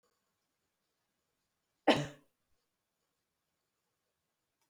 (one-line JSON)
{"cough_length": "4.7 s", "cough_amplitude": 9185, "cough_signal_mean_std_ratio": 0.14, "survey_phase": "beta (2021-08-13 to 2022-03-07)", "age": "65+", "gender": "Female", "wearing_mask": "No", "symptom_none": true, "smoker_status": "Ex-smoker", "respiratory_condition_asthma": false, "respiratory_condition_other": false, "recruitment_source": "REACT", "submission_delay": "2 days", "covid_test_result": "Negative", "covid_test_method": "RT-qPCR", "influenza_a_test_result": "Negative", "influenza_b_test_result": "Negative"}